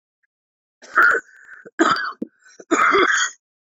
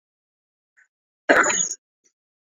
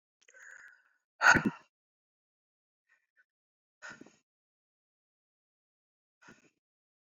{"three_cough_length": "3.7 s", "three_cough_amplitude": 25013, "three_cough_signal_mean_std_ratio": 0.48, "cough_length": "2.5 s", "cough_amplitude": 26973, "cough_signal_mean_std_ratio": 0.3, "exhalation_length": "7.2 s", "exhalation_amplitude": 12885, "exhalation_signal_mean_std_ratio": 0.15, "survey_phase": "beta (2021-08-13 to 2022-03-07)", "age": "45-64", "gender": "Male", "wearing_mask": "No", "symptom_cough_any": true, "symptom_fatigue": true, "symptom_change_to_sense_of_smell_or_taste": true, "symptom_loss_of_taste": true, "smoker_status": "Never smoked", "respiratory_condition_asthma": false, "respiratory_condition_other": false, "recruitment_source": "Test and Trace", "submission_delay": "2 days", "covid_test_result": "Positive", "covid_test_method": "RT-qPCR", "covid_ct_value": 23.7, "covid_ct_gene": "ORF1ab gene", "covid_ct_mean": 24.5, "covid_viral_load": "9400 copies/ml", "covid_viral_load_category": "Minimal viral load (< 10K copies/ml)"}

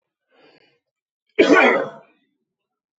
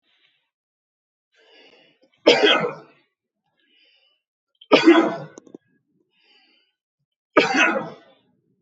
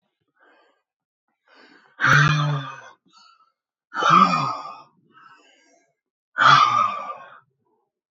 {"cough_length": "3.0 s", "cough_amplitude": 28790, "cough_signal_mean_std_ratio": 0.32, "three_cough_length": "8.6 s", "three_cough_amplitude": 29110, "three_cough_signal_mean_std_ratio": 0.3, "exhalation_length": "8.1 s", "exhalation_amplitude": 25645, "exhalation_signal_mean_std_ratio": 0.39, "survey_phase": "beta (2021-08-13 to 2022-03-07)", "age": "18-44", "gender": "Male", "wearing_mask": "No", "symptom_none": true, "smoker_status": "Never smoked", "respiratory_condition_asthma": true, "respiratory_condition_other": false, "recruitment_source": "REACT", "submission_delay": "1 day", "covid_test_result": "Negative", "covid_test_method": "RT-qPCR"}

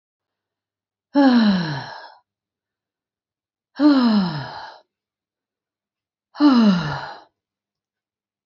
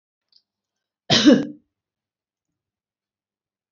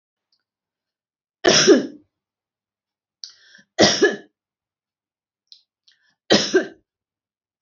{"exhalation_length": "8.5 s", "exhalation_amplitude": 20594, "exhalation_signal_mean_std_ratio": 0.41, "cough_length": "3.7 s", "cough_amplitude": 28688, "cough_signal_mean_std_ratio": 0.23, "three_cough_length": "7.6 s", "three_cough_amplitude": 32477, "three_cough_signal_mean_std_ratio": 0.28, "survey_phase": "beta (2021-08-13 to 2022-03-07)", "age": "45-64", "gender": "Female", "wearing_mask": "No", "symptom_none": true, "smoker_status": "Never smoked", "respiratory_condition_asthma": false, "respiratory_condition_other": false, "recruitment_source": "REACT", "submission_delay": "2 days", "covid_test_result": "Negative", "covid_test_method": "RT-qPCR"}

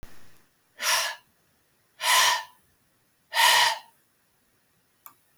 {"exhalation_length": "5.4 s", "exhalation_amplitude": 13701, "exhalation_signal_mean_std_ratio": 0.39, "survey_phase": "beta (2021-08-13 to 2022-03-07)", "age": "65+", "gender": "Female", "wearing_mask": "No", "symptom_cough_any": true, "symptom_fatigue": true, "symptom_other": true, "smoker_status": "Never smoked", "respiratory_condition_asthma": false, "respiratory_condition_other": false, "recruitment_source": "Test and Trace", "submission_delay": "1 day", "covid_test_result": "Positive", "covid_test_method": "ePCR"}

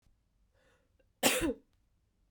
{"cough_length": "2.3 s", "cough_amplitude": 11483, "cough_signal_mean_std_ratio": 0.29, "survey_phase": "beta (2021-08-13 to 2022-03-07)", "age": "18-44", "gender": "Female", "wearing_mask": "No", "symptom_cough_any": true, "symptom_runny_or_blocked_nose": true, "symptom_change_to_sense_of_smell_or_taste": true, "symptom_loss_of_taste": true, "symptom_onset": "4 days", "smoker_status": "Ex-smoker", "respiratory_condition_asthma": false, "respiratory_condition_other": false, "recruitment_source": "Test and Trace", "submission_delay": "3 days", "covid_test_result": "Positive", "covid_test_method": "RT-qPCR", "covid_ct_value": 14.7, "covid_ct_gene": "ORF1ab gene", "covid_ct_mean": 15.7, "covid_viral_load": "7100000 copies/ml", "covid_viral_load_category": "High viral load (>1M copies/ml)"}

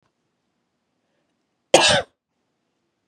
{"cough_length": "3.1 s", "cough_amplitude": 32767, "cough_signal_mean_std_ratio": 0.23, "survey_phase": "beta (2021-08-13 to 2022-03-07)", "age": "45-64", "gender": "Female", "wearing_mask": "No", "symptom_cough_any": true, "symptom_runny_or_blocked_nose": true, "symptom_sore_throat": true, "symptom_abdominal_pain": true, "symptom_diarrhoea": true, "symptom_fatigue": true, "symptom_fever_high_temperature": true, "symptom_headache": true, "symptom_change_to_sense_of_smell_or_taste": true, "smoker_status": "Never smoked", "respiratory_condition_asthma": false, "respiratory_condition_other": false, "recruitment_source": "Test and Trace", "submission_delay": "2 days", "covid_test_result": "Positive", "covid_test_method": "RT-qPCR", "covid_ct_value": 24.0, "covid_ct_gene": "ORF1ab gene"}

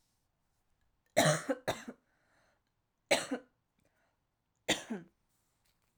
{"three_cough_length": "6.0 s", "three_cough_amplitude": 6557, "three_cough_signal_mean_std_ratio": 0.28, "survey_phase": "alpha (2021-03-01 to 2021-08-12)", "age": "18-44", "gender": "Female", "wearing_mask": "No", "symptom_cough_any": true, "symptom_new_continuous_cough": true, "symptom_fatigue": true, "symptom_fever_high_temperature": true, "symptom_headache": true, "symptom_onset": "3 days", "smoker_status": "Prefer not to say", "respiratory_condition_asthma": false, "respiratory_condition_other": false, "recruitment_source": "Test and Trace", "submission_delay": "1 day", "covid_test_result": "Positive", "covid_test_method": "RT-qPCR"}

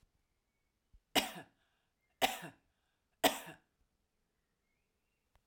{"three_cough_length": "5.5 s", "three_cough_amplitude": 6016, "three_cough_signal_mean_std_ratio": 0.21, "survey_phase": "alpha (2021-03-01 to 2021-08-12)", "age": "45-64", "gender": "Female", "wearing_mask": "No", "symptom_headache": true, "symptom_onset": "6 days", "smoker_status": "Never smoked", "respiratory_condition_asthma": false, "respiratory_condition_other": false, "recruitment_source": "REACT", "submission_delay": "1 day", "covid_test_result": "Negative", "covid_test_method": "RT-qPCR"}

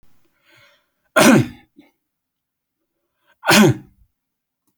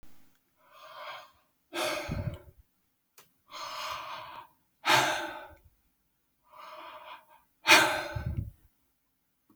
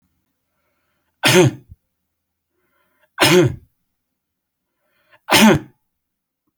{"cough_length": "4.8 s", "cough_amplitude": 32767, "cough_signal_mean_std_ratio": 0.29, "exhalation_length": "9.6 s", "exhalation_amplitude": 16296, "exhalation_signal_mean_std_ratio": 0.35, "three_cough_length": "6.6 s", "three_cough_amplitude": 32768, "three_cough_signal_mean_std_ratio": 0.31, "survey_phase": "beta (2021-08-13 to 2022-03-07)", "age": "45-64", "gender": "Male", "wearing_mask": "No", "symptom_none": true, "smoker_status": "Never smoked", "respiratory_condition_asthma": false, "respiratory_condition_other": false, "recruitment_source": "REACT", "submission_delay": "1 day", "covid_test_result": "Negative", "covid_test_method": "RT-qPCR"}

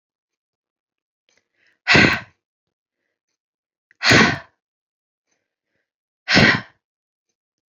{"exhalation_length": "7.7 s", "exhalation_amplitude": 31726, "exhalation_signal_mean_std_ratio": 0.27, "survey_phase": "beta (2021-08-13 to 2022-03-07)", "age": "18-44", "gender": "Female", "wearing_mask": "No", "symptom_cough_any": true, "symptom_new_continuous_cough": true, "symptom_runny_or_blocked_nose": true, "symptom_shortness_of_breath": true, "symptom_sore_throat": true, "symptom_onset": "8 days", "smoker_status": "Never smoked", "respiratory_condition_asthma": false, "respiratory_condition_other": false, "recruitment_source": "REACT", "submission_delay": "0 days", "covid_test_result": "Positive", "covid_test_method": "RT-qPCR", "covid_ct_value": 24.6, "covid_ct_gene": "E gene", "influenza_a_test_result": "Negative", "influenza_b_test_result": "Negative"}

